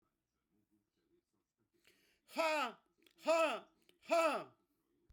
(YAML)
exhalation_length: 5.1 s
exhalation_amplitude: 2301
exhalation_signal_mean_std_ratio: 0.37
survey_phase: beta (2021-08-13 to 2022-03-07)
age: 45-64
gender: Female
wearing_mask: 'No'
symptom_none: true
smoker_status: Never smoked
respiratory_condition_asthma: false
respiratory_condition_other: false
recruitment_source: REACT
submission_delay: 3 days
covid_test_result: Negative
covid_test_method: RT-qPCR